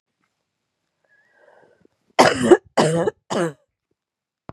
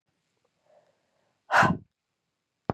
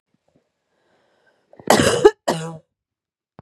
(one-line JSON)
{"three_cough_length": "4.5 s", "three_cough_amplitude": 32551, "three_cough_signal_mean_std_ratio": 0.31, "exhalation_length": "2.7 s", "exhalation_amplitude": 13155, "exhalation_signal_mean_std_ratio": 0.24, "cough_length": "3.4 s", "cough_amplitude": 32768, "cough_signal_mean_std_ratio": 0.28, "survey_phase": "beta (2021-08-13 to 2022-03-07)", "age": "18-44", "gender": "Female", "wearing_mask": "No", "symptom_new_continuous_cough": true, "symptom_fatigue": true, "symptom_headache": true, "symptom_onset": "11 days", "smoker_status": "Never smoked", "respiratory_condition_asthma": false, "respiratory_condition_other": false, "recruitment_source": "REACT", "submission_delay": "1 day", "covid_test_result": "Positive", "covid_test_method": "RT-qPCR", "covid_ct_value": 24.0, "covid_ct_gene": "E gene", "influenza_a_test_result": "Negative", "influenza_b_test_result": "Negative"}